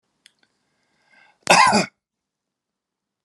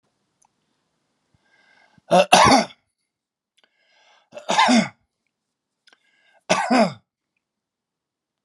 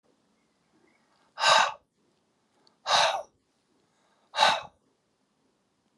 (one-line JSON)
{"cough_length": "3.2 s", "cough_amplitude": 32768, "cough_signal_mean_std_ratio": 0.26, "three_cough_length": "8.4 s", "three_cough_amplitude": 32767, "three_cough_signal_mean_std_ratio": 0.29, "exhalation_length": "6.0 s", "exhalation_amplitude": 15477, "exhalation_signal_mean_std_ratio": 0.3, "survey_phase": "alpha (2021-03-01 to 2021-08-12)", "age": "45-64", "gender": "Male", "wearing_mask": "No", "symptom_none": true, "symptom_onset": "12 days", "smoker_status": "Ex-smoker", "respiratory_condition_asthma": false, "respiratory_condition_other": false, "recruitment_source": "REACT", "submission_delay": "1 day", "covid_test_result": "Negative", "covid_test_method": "RT-qPCR"}